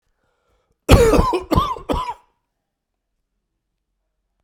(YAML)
cough_length: 4.4 s
cough_amplitude: 32768
cough_signal_mean_std_ratio: 0.34
survey_phase: beta (2021-08-13 to 2022-03-07)
age: 45-64
gender: Male
wearing_mask: 'No'
symptom_cough_any: true
symptom_shortness_of_breath: true
symptom_fatigue: true
symptom_onset: 4 days
smoker_status: Ex-smoker
respiratory_condition_asthma: false
respiratory_condition_other: false
recruitment_source: Test and Trace
submission_delay: 2 days
covid_test_result: Positive
covid_test_method: RT-qPCR
covid_ct_value: 19.4
covid_ct_gene: ORF1ab gene